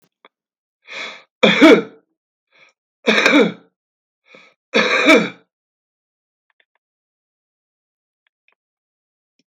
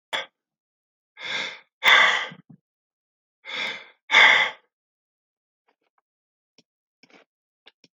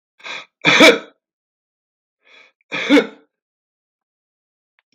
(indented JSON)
{
  "three_cough_length": "9.5 s",
  "three_cough_amplitude": 32768,
  "three_cough_signal_mean_std_ratio": 0.29,
  "exhalation_length": "7.9 s",
  "exhalation_amplitude": 23632,
  "exhalation_signal_mean_std_ratio": 0.29,
  "cough_length": "4.9 s",
  "cough_amplitude": 32768,
  "cough_signal_mean_std_ratio": 0.27,
  "survey_phase": "beta (2021-08-13 to 2022-03-07)",
  "age": "65+",
  "gender": "Male",
  "wearing_mask": "No",
  "symptom_none": true,
  "smoker_status": "Current smoker (11 or more cigarettes per day)",
  "respiratory_condition_asthma": false,
  "respiratory_condition_other": false,
  "recruitment_source": "REACT",
  "submission_delay": "0 days",
  "covid_test_result": "Negative",
  "covid_test_method": "RT-qPCR",
  "influenza_a_test_result": "Negative",
  "influenza_b_test_result": "Negative"
}